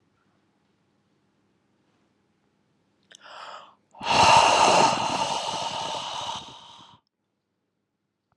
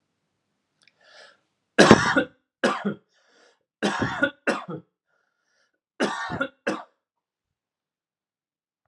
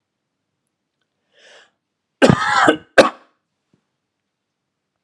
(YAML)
exhalation_length: 8.4 s
exhalation_amplitude: 17657
exhalation_signal_mean_std_ratio: 0.38
three_cough_length: 8.9 s
three_cough_amplitude: 32768
three_cough_signal_mean_std_ratio: 0.29
cough_length: 5.0 s
cough_amplitude: 32768
cough_signal_mean_std_ratio: 0.25
survey_phase: beta (2021-08-13 to 2022-03-07)
age: 18-44
gender: Male
wearing_mask: 'No'
symptom_none: true
smoker_status: Never smoked
respiratory_condition_asthma: false
respiratory_condition_other: false
recruitment_source: REACT
submission_delay: 1 day
covid_test_result: Negative
covid_test_method: RT-qPCR
influenza_a_test_result: Negative
influenza_b_test_result: Negative